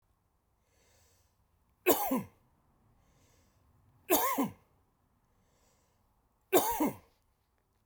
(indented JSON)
{
  "three_cough_length": "7.9 s",
  "three_cough_amplitude": 9460,
  "three_cough_signal_mean_std_ratio": 0.3,
  "survey_phase": "beta (2021-08-13 to 2022-03-07)",
  "age": "65+",
  "gender": "Male",
  "wearing_mask": "No",
  "symptom_none": true,
  "smoker_status": "Ex-smoker",
  "respiratory_condition_asthma": false,
  "respiratory_condition_other": false,
  "recruitment_source": "REACT",
  "submission_delay": "1 day",
  "covid_test_result": "Negative",
  "covid_test_method": "RT-qPCR"
}